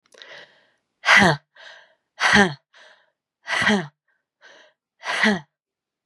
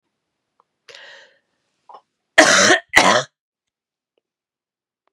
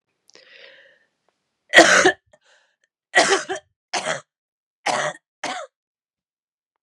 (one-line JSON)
{"exhalation_length": "6.1 s", "exhalation_amplitude": 29348, "exhalation_signal_mean_std_ratio": 0.35, "cough_length": "5.1 s", "cough_amplitude": 32768, "cough_signal_mean_std_ratio": 0.29, "three_cough_length": "6.8 s", "three_cough_amplitude": 32768, "three_cough_signal_mean_std_ratio": 0.3, "survey_phase": "beta (2021-08-13 to 2022-03-07)", "age": "45-64", "gender": "Female", "wearing_mask": "No", "symptom_new_continuous_cough": true, "symptom_runny_or_blocked_nose": true, "symptom_sore_throat": true, "symptom_abdominal_pain": true, "symptom_fatigue": true, "symptom_fever_high_temperature": true, "symptom_headache": true, "symptom_onset": "4 days", "smoker_status": "Ex-smoker", "respiratory_condition_asthma": false, "respiratory_condition_other": false, "recruitment_source": "Test and Trace", "submission_delay": "1 day", "covid_test_result": "Positive", "covid_test_method": "RT-qPCR", "covid_ct_value": 28.0, "covid_ct_gene": "ORF1ab gene", "covid_ct_mean": 28.7, "covid_viral_load": "380 copies/ml", "covid_viral_load_category": "Minimal viral load (< 10K copies/ml)"}